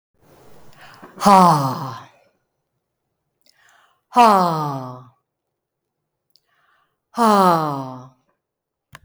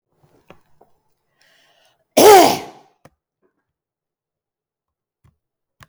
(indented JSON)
{
  "exhalation_length": "9.0 s",
  "exhalation_amplitude": 32766,
  "exhalation_signal_mean_std_ratio": 0.34,
  "cough_length": "5.9 s",
  "cough_amplitude": 32768,
  "cough_signal_mean_std_ratio": 0.21,
  "survey_phase": "beta (2021-08-13 to 2022-03-07)",
  "age": "45-64",
  "gender": "Female",
  "wearing_mask": "No",
  "symptom_none": true,
  "smoker_status": "Ex-smoker",
  "respiratory_condition_asthma": false,
  "respiratory_condition_other": false,
  "recruitment_source": "REACT",
  "submission_delay": "1 day",
  "covid_test_result": "Negative",
  "covid_test_method": "RT-qPCR"
}